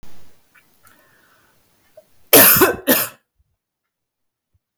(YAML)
cough_length: 4.8 s
cough_amplitude: 32768
cough_signal_mean_std_ratio: 0.3
survey_phase: beta (2021-08-13 to 2022-03-07)
age: 45-64
gender: Female
wearing_mask: 'No'
symptom_cough_any: true
symptom_fatigue: true
symptom_change_to_sense_of_smell_or_taste: true
symptom_loss_of_taste: true
symptom_other: true
symptom_onset: 3 days
smoker_status: Never smoked
respiratory_condition_asthma: false
respiratory_condition_other: false
recruitment_source: Test and Trace
submission_delay: 1 day
covid_test_result: Positive
covid_test_method: RT-qPCR
covid_ct_value: 22.3
covid_ct_gene: ORF1ab gene
covid_ct_mean: 23.0
covid_viral_load: 29000 copies/ml
covid_viral_load_category: Low viral load (10K-1M copies/ml)